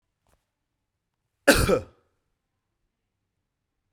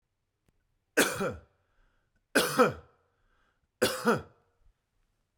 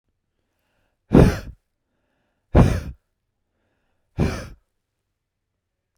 {"cough_length": "3.9 s", "cough_amplitude": 27262, "cough_signal_mean_std_ratio": 0.21, "three_cough_length": "5.4 s", "three_cough_amplitude": 12834, "three_cough_signal_mean_std_ratio": 0.32, "exhalation_length": "6.0 s", "exhalation_amplitude": 32768, "exhalation_signal_mean_std_ratio": 0.25, "survey_phase": "beta (2021-08-13 to 2022-03-07)", "age": "45-64", "gender": "Male", "wearing_mask": "No", "symptom_none": true, "smoker_status": "Never smoked", "respiratory_condition_asthma": false, "respiratory_condition_other": false, "recruitment_source": "REACT", "submission_delay": "2 days", "covid_test_result": "Negative", "covid_test_method": "RT-qPCR", "influenza_a_test_result": "Negative", "influenza_b_test_result": "Negative"}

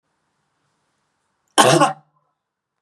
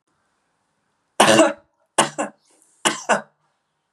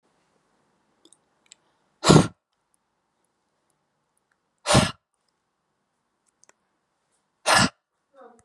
{"cough_length": "2.8 s", "cough_amplitude": 32767, "cough_signal_mean_std_ratio": 0.27, "three_cough_length": "3.9 s", "three_cough_amplitude": 32768, "three_cough_signal_mean_std_ratio": 0.32, "exhalation_length": "8.4 s", "exhalation_amplitude": 32104, "exhalation_signal_mean_std_ratio": 0.21, "survey_phase": "beta (2021-08-13 to 2022-03-07)", "age": "18-44", "gender": "Female", "wearing_mask": "No", "symptom_none": true, "smoker_status": "Never smoked", "respiratory_condition_asthma": false, "respiratory_condition_other": false, "recruitment_source": "REACT", "submission_delay": "6 days", "covid_test_result": "Negative", "covid_test_method": "RT-qPCR", "influenza_a_test_result": "Negative", "influenza_b_test_result": "Negative"}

